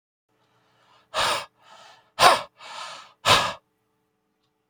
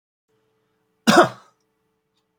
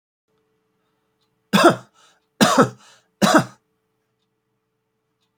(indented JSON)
{
  "exhalation_length": "4.7 s",
  "exhalation_amplitude": 28646,
  "exhalation_signal_mean_std_ratio": 0.31,
  "cough_length": "2.4 s",
  "cough_amplitude": 27497,
  "cough_signal_mean_std_ratio": 0.23,
  "three_cough_length": "5.4 s",
  "three_cough_amplitude": 29072,
  "three_cough_signal_mean_std_ratio": 0.29,
  "survey_phase": "beta (2021-08-13 to 2022-03-07)",
  "age": "65+",
  "gender": "Male",
  "wearing_mask": "No",
  "symptom_none": true,
  "smoker_status": "Never smoked",
  "respiratory_condition_asthma": false,
  "respiratory_condition_other": false,
  "recruitment_source": "REACT",
  "submission_delay": "1 day",
  "covid_test_result": "Negative",
  "covid_test_method": "RT-qPCR"
}